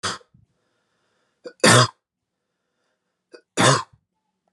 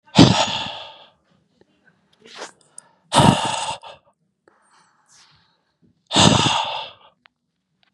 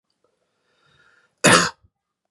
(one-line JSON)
{"three_cough_length": "4.5 s", "three_cough_amplitude": 29057, "three_cough_signal_mean_std_ratio": 0.27, "exhalation_length": "7.9 s", "exhalation_amplitude": 32768, "exhalation_signal_mean_std_ratio": 0.34, "cough_length": "2.3 s", "cough_amplitude": 31779, "cough_signal_mean_std_ratio": 0.25, "survey_phase": "beta (2021-08-13 to 2022-03-07)", "age": "18-44", "gender": "Male", "wearing_mask": "No", "symptom_cough_any": true, "symptom_runny_or_blocked_nose": true, "symptom_sore_throat": true, "symptom_fatigue": true, "smoker_status": "Never smoked", "respiratory_condition_asthma": false, "respiratory_condition_other": false, "recruitment_source": "Test and Trace", "submission_delay": "2 days", "covid_test_result": "Positive", "covid_test_method": "RT-qPCR", "covid_ct_value": 32.3, "covid_ct_gene": "ORF1ab gene"}